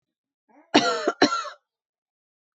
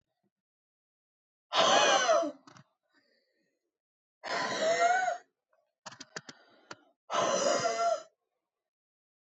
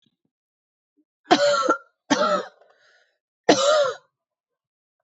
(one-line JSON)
{"cough_length": "2.6 s", "cough_amplitude": 23792, "cough_signal_mean_std_ratio": 0.34, "exhalation_length": "9.2 s", "exhalation_amplitude": 8903, "exhalation_signal_mean_std_ratio": 0.45, "three_cough_length": "5.0 s", "three_cough_amplitude": 24438, "three_cough_signal_mean_std_ratio": 0.4, "survey_phase": "beta (2021-08-13 to 2022-03-07)", "age": "18-44", "gender": "Female", "wearing_mask": "No", "symptom_runny_or_blocked_nose": true, "symptom_fatigue": true, "symptom_headache": true, "symptom_change_to_sense_of_smell_or_taste": true, "symptom_loss_of_taste": true, "symptom_onset": "3 days", "smoker_status": "Ex-smoker", "respiratory_condition_asthma": false, "respiratory_condition_other": false, "recruitment_source": "Test and Trace", "submission_delay": "1 day", "covid_test_result": "Positive", "covid_test_method": "ePCR"}